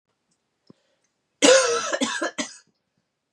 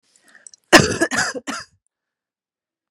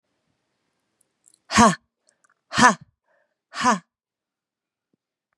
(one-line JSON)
{"three_cough_length": "3.3 s", "three_cough_amplitude": 30417, "three_cough_signal_mean_std_ratio": 0.36, "cough_length": "2.9 s", "cough_amplitude": 32768, "cough_signal_mean_std_ratio": 0.29, "exhalation_length": "5.4 s", "exhalation_amplitude": 32729, "exhalation_signal_mean_std_ratio": 0.25, "survey_phase": "beta (2021-08-13 to 2022-03-07)", "age": "18-44", "gender": "Female", "wearing_mask": "No", "symptom_cough_any": true, "symptom_runny_or_blocked_nose": true, "symptom_sore_throat": true, "symptom_fever_high_temperature": true, "symptom_headache": true, "smoker_status": "Never smoked", "respiratory_condition_asthma": false, "respiratory_condition_other": false, "recruitment_source": "Test and Trace", "submission_delay": "2 days", "covid_test_result": "Positive", "covid_test_method": "LFT"}